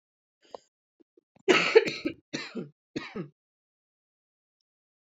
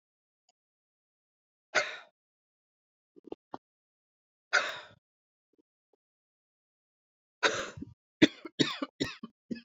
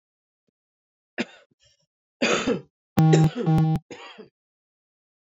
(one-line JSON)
{"cough_length": "5.1 s", "cough_amplitude": 19522, "cough_signal_mean_std_ratio": 0.25, "exhalation_length": "9.6 s", "exhalation_amplitude": 14092, "exhalation_signal_mean_std_ratio": 0.22, "three_cough_length": "5.3 s", "three_cough_amplitude": 20051, "three_cough_signal_mean_std_ratio": 0.4, "survey_phase": "beta (2021-08-13 to 2022-03-07)", "age": "18-44", "gender": "Female", "wearing_mask": "No", "symptom_cough_any": true, "symptom_new_continuous_cough": true, "symptom_runny_or_blocked_nose": true, "symptom_fatigue": true, "symptom_onset": "5 days", "smoker_status": "Never smoked", "respiratory_condition_asthma": false, "respiratory_condition_other": false, "recruitment_source": "Test and Trace", "submission_delay": "2 days", "covid_test_result": "Positive", "covid_test_method": "RT-qPCR", "covid_ct_value": 18.6, "covid_ct_gene": "ORF1ab gene", "covid_ct_mean": 19.2, "covid_viral_load": "500000 copies/ml", "covid_viral_load_category": "Low viral load (10K-1M copies/ml)"}